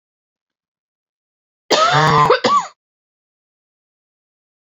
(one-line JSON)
{"cough_length": "4.8 s", "cough_amplitude": 30791, "cough_signal_mean_std_ratio": 0.36, "survey_phase": "beta (2021-08-13 to 2022-03-07)", "age": "18-44", "gender": "Female", "wearing_mask": "No", "symptom_cough_any": true, "symptom_runny_or_blocked_nose": true, "symptom_sore_throat": true, "symptom_abdominal_pain": true, "symptom_fatigue": true, "symptom_fever_high_temperature": true, "symptom_headache": true, "smoker_status": "Never smoked", "respiratory_condition_asthma": false, "respiratory_condition_other": false, "recruitment_source": "Test and Trace", "submission_delay": "1 day", "covid_test_result": "Positive", "covid_test_method": "RT-qPCR", "covid_ct_value": 19.6, "covid_ct_gene": "ORF1ab gene", "covid_ct_mean": 21.0, "covid_viral_load": "130000 copies/ml", "covid_viral_load_category": "Low viral load (10K-1M copies/ml)"}